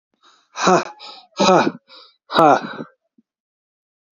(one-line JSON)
{"exhalation_length": "4.2 s", "exhalation_amplitude": 28857, "exhalation_signal_mean_std_ratio": 0.37, "survey_phase": "beta (2021-08-13 to 2022-03-07)", "age": "18-44", "gender": "Male", "wearing_mask": "No", "symptom_cough_any": true, "symptom_runny_or_blocked_nose": true, "symptom_shortness_of_breath": true, "symptom_fatigue": true, "symptom_onset": "3 days", "smoker_status": "Ex-smoker", "respiratory_condition_asthma": true, "respiratory_condition_other": false, "recruitment_source": "Test and Trace", "submission_delay": "1 day", "covid_test_result": "Positive", "covid_test_method": "RT-qPCR", "covid_ct_value": 20.6, "covid_ct_gene": "ORF1ab gene", "covid_ct_mean": 21.1, "covid_viral_load": "120000 copies/ml", "covid_viral_load_category": "Low viral load (10K-1M copies/ml)"}